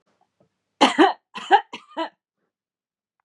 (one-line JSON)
{"three_cough_length": "3.2 s", "three_cough_amplitude": 29370, "three_cough_signal_mean_std_ratio": 0.28, "survey_phase": "beta (2021-08-13 to 2022-03-07)", "age": "45-64", "gender": "Female", "wearing_mask": "No", "symptom_none": true, "smoker_status": "Never smoked", "respiratory_condition_asthma": false, "respiratory_condition_other": false, "recruitment_source": "REACT", "submission_delay": "1 day", "covid_test_result": "Negative", "covid_test_method": "RT-qPCR", "influenza_a_test_result": "Negative", "influenza_b_test_result": "Negative"}